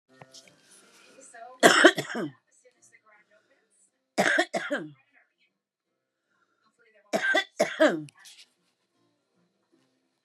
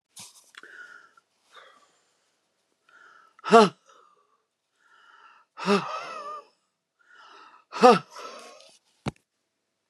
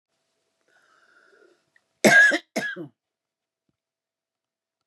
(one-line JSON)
{"three_cough_length": "10.2 s", "three_cough_amplitude": 28038, "three_cough_signal_mean_std_ratio": 0.29, "exhalation_length": "9.9 s", "exhalation_amplitude": 30022, "exhalation_signal_mean_std_ratio": 0.21, "cough_length": "4.9 s", "cough_amplitude": 24446, "cough_signal_mean_std_ratio": 0.25, "survey_phase": "beta (2021-08-13 to 2022-03-07)", "age": "65+", "gender": "Female", "wearing_mask": "No", "symptom_cough_any": true, "symptom_runny_or_blocked_nose": true, "symptom_shortness_of_breath": true, "symptom_sore_throat": true, "smoker_status": "Current smoker (11 or more cigarettes per day)", "respiratory_condition_asthma": false, "respiratory_condition_other": false, "recruitment_source": "REACT", "submission_delay": "-1 day", "covid_test_result": "Negative", "covid_test_method": "RT-qPCR", "influenza_a_test_result": "Unknown/Void", "influenza_b_test_result": "Unknown/Void"}